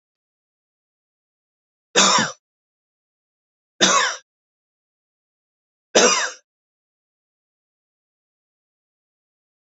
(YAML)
three_cough_length: 9.6 s
three_cough_amplitude: 32531
three_cough_signal_mean_std_ratio: 0.25
survey_phase: beta (2021-08-13 to 2022-03-07)
age: 45-64
gender: Male
wearing_mask: 'No'
symptom_none: true
smoker_status: Never smoked
respiratory_condition_asthma: false
respiratory_condition_other: false
recruitment_source: REACT
submission_delay: 2 days
covid_test_result: Negative
covid_test_method: RT-qPCR
influenza_a_test_result: Negative
influenza_b_test_result: Negative